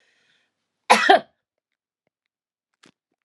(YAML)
cough_length: 3.2 s
cough_amplitude: 32517
cough_signal_mean_std_ratio: 0.22
survey_phase: beta (2021-08-13 to 2022-03-07)
age: 45-64
gender: Female
wearing_mask: 'No'
symptom_none: true
smoker_status: Ex-smoker
respiratory_condition_asthma: false
respiratory_condition_other: false
recruitment_source: REACT
submission_delay: 1 day
covid_test_result: Negative
covid_test_method: RT-qPCR